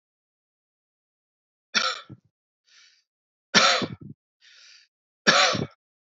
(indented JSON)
{
  "three_cough_length": "6.1 s",
  "three_cough_amplitude": 25142,
  "three_cough_signal_mean_std_ratio": 0.3,
  "survey_phase": "alpha (2021-03-01 to 2021-08-12)",
  "age": "18-44",
  "gender": "Male",
  "wearing_mask": "No",
  "symptom_none": true,
  "smoker_status": "Never smoked",
  "respiratory_condition_asthma": false,
  "respiratory_condition_other": false,
  "recruitment_source": "REACT",
  "submission_delay": "1 day",
  "covid_test_result": "Negative",
  "covid_test_method": "RT-qPCR"
}